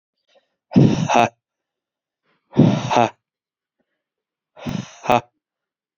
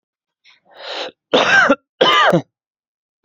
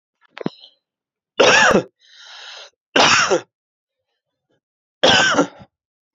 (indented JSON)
{
  "exhalation_length": "6.0 s",
  "exhalation_amplitude": 28003,
  "exhalation_signal_mean_std_ratio": 0.33,
  "cough_length": "3.2 s",
  "cough_amplitude": 29039,
  "cough_signal_mean_std_ratio": 0.45,
  "three_cough_length": "6.1 s",
  "three_cough_amplitude": 30741,
  "three_cough_signal_mean_std_ratio": 0.39,
  "survey_phase": "beta (2021-08-13 to 2022-03-07)",
  "age": "18-44",
  "gender": "Male",
  "wearing_mask": "No",
  "symptom_none": true,
  "smoker_status": "Current smoker (1 to 10 cigarettes per day)",
  "respiratory_condition_asthma": false,
  "respiratory_condition_other": false,
  "recruitment_source": "REACT",
  "submission_delay": "3 days",
  "covid_test_result": "Negative",
  "covid_test_method": "RT-qPCR",
  "influenza_a_test_result": "Negative",
  "influenza_b_test_result": "Negative"
}